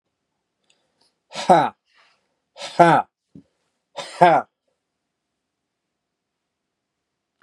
{"exhalation_length": "7.4 s", "exhalation_amplitude": 32275, "exhalation_signal_mean_std_ratio": 0.24, "survey_phase": "beta (2021-08-13 to 2022-03-07)", "age": "45-64", "gender": "Male", "wearing_mask": "No", "symptom_none": true, "smoker_status": "Never smoked", "respiratory_condition_asthma": false, "respiratory_condition_other": false, "recruitment_source": "REACT", "submission_delay": "1 day", "covid_test_result": "Negative", "covid_test_method": "RT-qPCR"}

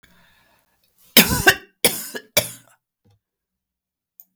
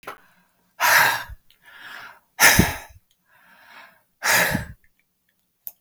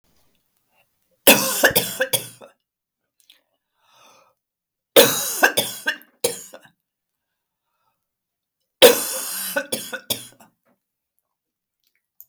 {"cough_length": "4.4 s", "cough_amplitude": 32768, "cough_signal_mean_std_ratio": 0.25, "exhalation_length": "5.8 s", "exhalation_amplitude": 32491, "exhalation_signal_mean_std_ratio": 0.36, "three_cough_length": "12.3 s", "three_cough_amplitude": 32768, "three_cough_signal_mean_std_ratio": 0.28, "survey_phase": "beta (2021-08-13 to 2022-03-07)", "age": "65+", "gender": "Female", "wearing_mask": "No", "symptom_none": true, "smoker_status": "Never smoked", "respiratory_condition_asthma": false, "respiratory_condition_other": false, "recruitment_source": "REACT", "submission_delay": "1 day", "covid_test_result": "Negative", "covid_test_method": "RT-qPCR", "influenza_a_test_result": "Negative", "influenza_b_test_result": "Negative"}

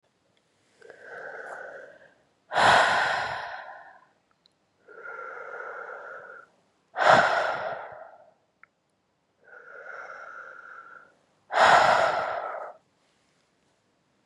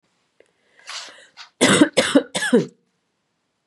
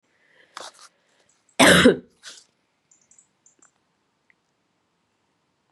{"exhalation_length": "14.3 s", "exhalation_amplitude": 19876, "exhalation_signal_mean_std_ratio": 0.39, "three_cough_length": "3.7 s", "three_cough_amplitude": 28608, "three_cough_signal_mean_std_ratio": 0.36, "cough_length": "5.7 s", "cough_amplitude": 31158, "cough_signal_mean_std_ratio": 0.21, "survey_phase": "beta (2021-08-13 to 2022-03-07)", "age": "45-64", "gender": "Female", "wearing_mask": "No", "symptom_runny_or_blocked_nose": true, "symptom_fatigue": true, "symptom_fever_high_temperature": true, "symptom_headache": true, "symptom_loss_of_taste": true, "symptom_other": true, "symptom_onset": "3 days", "smoker_status": "Never smoked", "respiratory_condition_asthma": false, "respiratory_condition_other": false, "recruitment_source": "Test and Trace", "submission_delay": "1 day", "covid_test_result": "Positive", "covid_test_method": "RT-qPCR", "covid_ct_value": 10.7, "covid_ct_gene": "ORF1ab gene", "covid_ct_mean": 11.0, "covid_viral_load": "250000000 copies/ml", "covid_viral_load_category": "High viral load (>1M copies/ml)"}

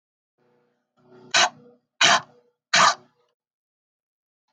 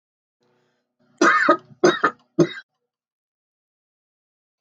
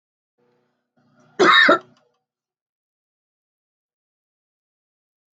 {"exhalation_length": "4.5 s", "exhalation_amplitude": 24277, "exhalation_signal_mean_std_ratio": 0.28, "three_cough_length": "4.6 s", "three_cough_amplitude": 24592, "three_cough_signal_mean_std_ratio": 0.3, "cough_length": "5.4 s", "cough_amplitude": 26283, "cough_signal_mean_std_ratio": 0.22, "survey_phase": "beta (2021-08-13 to 2022-03-07)", "age": "45-64", "gender": "Female", "wearing_mask": "No", "symptom_cough_any": true, "symptom_sore_throat": true, "smoker_status": "Never smoked", "respiratory_condition_asthma": true, "respiratory_condition_other": false, "recruitment_source": "REACT", "submission_delay": "1 day", "covid_test_result": "Negative", "covid_test_method": "RT-qPCR"}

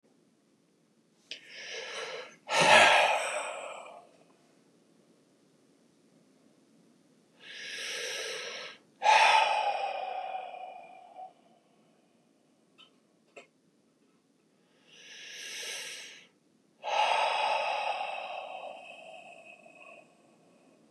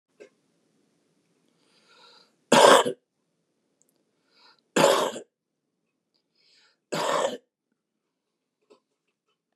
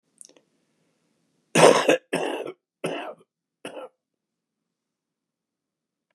{"exhalation_length": "20.9 s", "exhalation_amplitude": 13933, "exhalation_signal_mean_std_ratio": 0.39, "three_cough_length": "9.6 s", "three_cough_amplitude": 28536, "three_cough_signal_mean_std_ratio": 0.24, "cough_length": "6.1 s", "cough_amplitude": 31098, "cough_signal_mean_std_ratio": 0.26, "survey_phase": "beta (2021-08-13 to 2022-03-07)", "age": "65+", "gender": "Male", "wearing_mask": "No", "symptom_cough_any": true, "symptom_runny_or_blocked_nose": true, "smoker_status": "Ex-smoker", "respiratory_condition_asthma": false, "respiratory_condition_other": false, "recruitment_source": "REACT", "submission_delay": "2 days", "covid_test_result": "Negative", "covid_test_method": "RT-qPCR", "influenza_a_test_result": "Negative", "influenza_b_test_result": "Negative"}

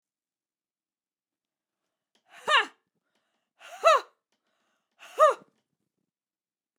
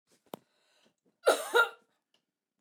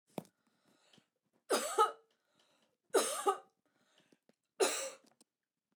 {"exhalation_length": "6.8 s", "exhalation_amplitude": 12459, "exhalation_signal_mean_std_ratio": 0.21, "cough_length": "2.6 s", "cough_amplitude": 8420, "cough_signal_mean_std_ratio": 0.27, "three_cough_length": "5.8 s", "three_cough_amplitude": 5048, "three_cough_signal_mean_std_ratio": 0.32, "survey_phase": "beta (2021-08-13 to 2022-03-07)", "age": "18-44", "gender": "Female", "wearing_mask": "No", "symptom_none": true, "smoker_status": "Never smoked", "respiratory_condition_asthma": false, "respiratory_condition_other": false, "recruitment_source": "Test and Trace", "submission_delay": "1 day", "covid_test_result": "Positive", "covid_test_method": "RT-qPCR", "covid_ct_value": 17.3, "covid_ct_gene": "ORF1ab gene"}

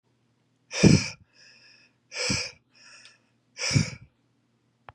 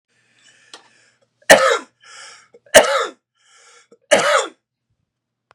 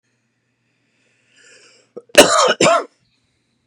{"exhalation_length": "4.9 s", "exhalation_amplitude": 20896, "exhalation_signal_mean_std_ratio": 0.29, "three_cough_length": "5.5 s", "three_cough_amplitude": 32768, "three_cough_signal_mean_std_ratio": 0.3, "cough_length": "3.7 s", "cough_amplitude": 32768, "cough_signal_mean_std_ratio": 0.31, "survey_phase": "beta (2021-08-13 to 2022-03-07)", "age": "18-44", "gender": "Male", "wearing_mask": "No", "symptom_none": true, "smoker_status": "Never smoked", "respiratory_condition_asthma": false, "respiratory_condition_other": false, "recruitment_source": "Test and Trace", "submission_delay": "2 days", "covid_test_result": "Negative", "covid_test_method": "ePCR"}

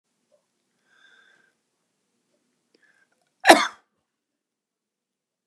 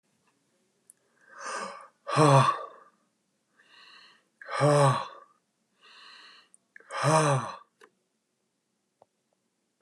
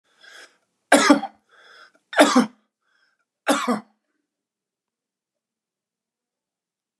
{"cough_length": "5.5 s", "cough_amplitude": 32768, "cough_signal_mean_std_ratio": 0.13, "exhalation_length": "9.8 s", "exhalation_amplitude": 14617, "exhalation_signal_mean_std_ratio": 0.33, "three_cough_length": "7.0 s", "three_cough_amplitude": 32768, "three_cough_signal_mean_std_ratio": 0.26, "survey_phase": "beta (2021-08-13 to 2022-03-07)", "age": "45-64", "gender": "Male", "wearing_mask": "No", "symptom_none": true, "smoker_status": "Never smoked", "respiratory_condition_asthma": true, "respiratory_condition_other": false, "recruitment_source": "REACT", "submission_delay": "1 day", "covid_test_result": "Negative", "covid_test_method": "RT-qPCR", "influenza_a_test_result": "Negative", "influenza_b_test_result": "Negative"}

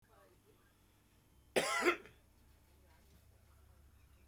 {"exhalation_length": "4.3 s", "exhalation_amplitude": 3826, "exhalation_signal_mean_std_ratio": 0.29, "survey_phase": "beta (2021-08-13 to 2022-03-07)", "age": "65+", "gender": "Male", "wearing_mask": "No", "symptom_cough_any": true, "symptom_onset": "8 days", "smoker_status": "Never smoked", "respiratory_condition_asthma": false, "respiratory_condition_other": false, "recruitment_source": "REACT", "submission_delay": "2 days", "covid_test_result": "Negative", "covid_test_method": "RT-qPCR", "influenza_a_test_result": "Unknown/Void", "influenza_b_test_result": "Unknown/Void"}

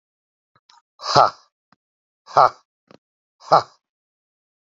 {"exhalation_length": "4.6 s", "exhalation_amplitude": 29319, "exhalation_signal_mean_std_ratio": 0.22, "survey_phase": "beta (2021-08-13 to 2022-03-07)", "age": "45-64", "gender": "Male", "wearing_mask": "No", "symptom_runny_or_blocked_nose": true, "symptom_onset": "3 days", "smoker_status": "Current smoker (1 to 10 cigarettes per day)", "respiratory_condition_asthma": false, "respiratory_condition_other": false, "recruitment_source": "Test and Trace", "submission_delay": "0 days", "covid_test_result": "Positive", "covid_test_method": "RT-qPCR"}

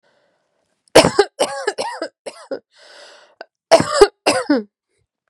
{"cough_length": "5.3 s", "cough_amplitude": 32768, "cough_signal_mean_std_ratio": 0.34, "survey_phase": "beta (2021-08-13 to 2022-03-07)", "age": "18-44", "gender": "Female", "wearing_mask": "No", "symptom_cough_any": true, "symptom_runny_or_blocked_nose": true, "symptom_fatigue": true, "symptom_headache": true, "symptom_onset": "3 days", "smoker_status": "Never smoked", "respiratory_condition_asthma": false, "respiratory_condition_other": false, "recruitment_source": "Test and Trace", "submission_delay": "2 days", "covid_test_result": "Positive", "covid_test_method": "ePCR"}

